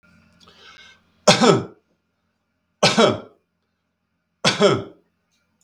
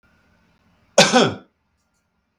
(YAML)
three_cough_length: 5.6 s
three_cough_amplitude: 32766
three_cough_signal_mean_std_ratio: 0.33
cough_length: 2.4 s
cough_amplitude: 32768
cough_signal_mean_std_ratio: 0.28
survey_phase: beta (2021-08-13 to 2022-03-07)
age: 45-64
gender: Male
wearing_mask: 'No'
symptom_none: true
smoker_status: Never smoked
respiratory_condition_asthma: false
respiratory_condition_other: false
recruitment_source: REACT
submission_delay: 1 day
covid_test_result: Negative
covid_test_method: RT-qPCR
influenza_a_test_result: Negative
influenza_b_test_result: Negative